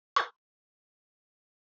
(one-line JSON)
{"cough_length": "1.6 s", "cough_amplitude": 7249, "cough_signal_mean_std_ratio": 0.17, "survey_phase": "alpha (2021-03-01 to 2021-08-12)", "age": "45-64", "gender": "Female", "wearing_mask": "No", "symptom_fatigue": true, "symptom_change_to_sense_of_smell_or_taste": true, "symptom_onset": "6 days", "smoker_status": "Never smoked", "respiratory_condition_asthma": false, "respiratory_condition_other": false, "recruitment_source": "Test and Trace", "submission_delay": "2 days", "covid_test_result": "Positive", "covid_test_method": "ePCR"}